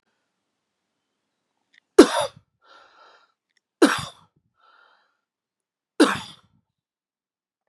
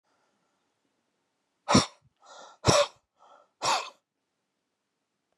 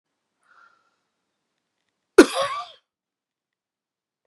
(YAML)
three_cough_length: 7.7 s
three_cough_amplitude: 32768
three_cough_signal_mean_std_ratio: 0.18
exhalation_length: 5.4 s
exhalation_amplitude: 17184
exhalation_signal_mean_std_ratio: 0.25
cough_length: 4.3 s
cough_amplitude: 32768
cough_signal_mean_std_ratio: 0.15
survey_phase: beta (2021-08-13 to 2022-03-07)
age: 65+
gender: Male
wearing_mask: 'No'
symptom_cough_any: true
symptom_runny_or_blocked_nose: true
symptom_sore_throat: true
symptom_fatigue: true
symptom_headache: true
symptom_onset: 3 days
smoker_status: Never smoked
respiratory_condition_asthma: false
respiratory_condition_other: false
recruitment_source: Test and Trace
submission_delay: 2 days
covid_test_result: Positive
covid_test_method: ePCR